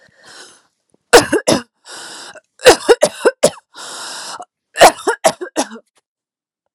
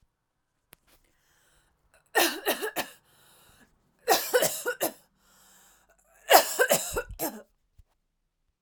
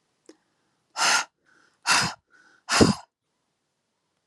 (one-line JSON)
{"cough_length": "6.7 s", "cough_amplitude": 32768, "cough_signal_mean_std_ratio": 0.34, "three_cough_length": "8.6 s", "three_cough_amplitude": 27917, "three_cough_signal_mean_std_ratio": 0.33, "exhalation_length": "4.3 s", "exhalation_amplitude": 21416, "exhalation_signal_mean_std_ratio": 0.32, "survey_phase": "alpha (2021-03-01 to 2021-08-12)", "age": "18-44", "gender": "Female", "wearing_mask": "No", "symptom_headache": true, "smoker_status": "Ex-smoker", "respiratory_condition_asthma": false, "respiratory_condition_other": false, "recruitment_source": "REACT", "submission_delay": "1 day", "covid_test_result": "Negative", "covid_test_method": "RT-qPCR"}